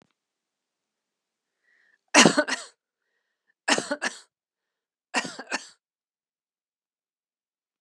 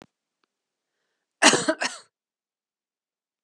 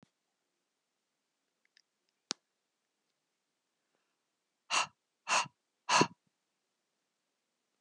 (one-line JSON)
{"three_cough_length": "7.8 s", "three_cough_amplitude": 29679, "three_cough_signal_mean_std_ratio": 0.21, "cough_length": "3.4 s", "cough_amplitude": 30415, "cough_signal_mean_std_ratio": 0.23, "exhalation_length": "7.8 s", "exhalation_amplitude": 9302, "exhalation_signal_mean_std_ratio": 0.19, "survey_phase": "beta (2021-08-13 to 2022-03-07)", "age": "45-64", "gender": "Female", "wearing_mask": "No", "symptom_none": true, "smoker_status": "Never smoked", "respiratory_condition_asthma": false, "respiratory_condition_other": false, "recruitment_source": "REACT", "submission_delay": "2 days", "covid_test_result": "Negative", "covid_test_method": "RT-qPCR", "influenza_a_test_result": "Negative", "influenza_b_test_result": "Negative"}